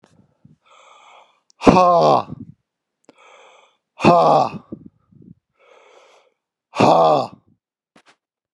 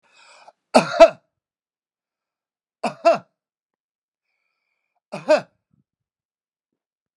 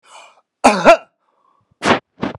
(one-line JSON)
{"exhalation_length": "8.5 s", "exhalation_amplitude": 32768, "exhalation_signal_mean_std_ratio": 0.34, "three_cough_length": "7.2 s", "three_cough_amplitude": 32767, "three_cough_signal_mean_std_ratio": 0.2, "cough_length": "2.4 s", "cough_amplitude": 32768, "cough_signal_mean_std_ratio": 0.34, "survey_phase": "beta (2021-08-13 to 2022-03-07)", "age": "45-64", "gender": "Male", "wearing_mask": "No", "symptom_none": true, "smoker_status": "Ex-smoker", "respiratory_condition_asthma": false, "respiratory_condition_other": false, "recruitment_source": "REACT", "submission_delay": "1 day", "covid_test_result": "Negative", "covid_test_method": "RT-qPCR", "influenza_a_test_result": "Negative", "influenza_b_test_result": "Negative"}